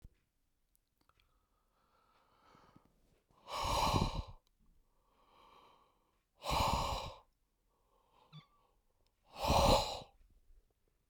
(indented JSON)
{
  "exhalation_length": "11.1 s",
  "exhalation_amplitude": 5242,
  "exhalation_signal_mean_std_ratio": 0.34,
  "survey_phase": "beta (2021-08-13 to 2022-03-07)",
  "age": "18-44",
  "gender": "Male",
  "wearing_mask": "No",
  "symptom_none": true,
  "smoker_status": "Never smoked",
  "respiratory_condition_asthma": false,
  "respiratory_condition_other": false,
  "recruitment_source": "REACT",
  "submission_delay": "1 day",
  "covid_test_result": "Negative",
  "covid_test_method": "RT-qPCR"
}